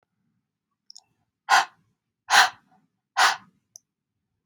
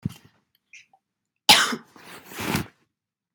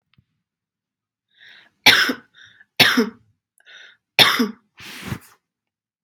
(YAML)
exhalation_length: 4.5 s
exhalation_amplitude: 23194
exhalation_signal_mean_std_ratio: 0.26
cough_length: 3.3 s
cough_amplitude: 32768
cough_signal_mean_std_ratio: 0.27
three_cough_length: 6.0 s
three_cough_amplitude: 32768
three_cough_signal_mean_std_ratio: 0.3
survey_phase: beta (2021-08-13 to 2022-03-07)
age: 18-44
gender: Female
wearing_mask: 'No'
symptom_none: true
smoker_status: Never smoked
respiratory_condition_asthma: false
respiratory_condition_other: false
recruitment_source: REACT
submission_delay: 0 days
covid_test_result: Negative
covid_test_method: RT-qPCR
influenza_a_test_result: Negative
influenza_b_test_result: Negative